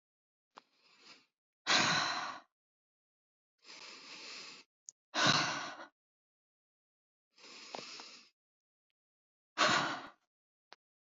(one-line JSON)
{"exhalation_length": "11.1 s", "exhalation_amplitude": 7013, "exhalation_signal_mean_std_ratio": 0.33, "survey_phase": "beta (2021-08-13 to 2022-03-07)", "age": "18-44", "gender": "Female", "wearing_mask": "No", "symptom_none": true, "smoker_status": "Never smoked", "respiratory_condition_asthma": false, "respiratory_condition_other": false, "recruitment_source": "REACT", "submission_delay": "3 days", "covid_test_result": "Negative", "covid_test_method": "RT-qPCR", "influenza_a_test_result": "Unknown/Void", "influenza_b_test_result": "Unknown/Void"}